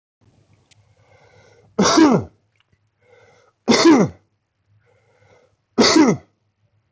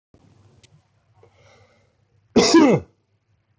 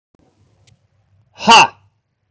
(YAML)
three_cough_length: 6.9 s
three_cough_amplitude: 24651
three_cough_signal_mean_std_ratio: 0.36
cough_length: 3.6 s
cough_amplitude: 20713
cough_signal_mean_std_ratio: 0.29
exhalation_length: 2.3 s
exhalation_amplitude: 32768
exhalation_signal_mean_std_ratio: 0.27
survey_phase: beta (2021-08-13 to 2022-03-07)
age: 18-44
gender: Male
wearing_mask: 'No'
symptom_none: true
smoker_status: Never smoked
respiratory_condition_asthma: false
respiratory_condition_other: false
recruitment_source: REACT
submission_delay: 5 days
covid_test_result: Negative
covid_test_method: RT-qPCR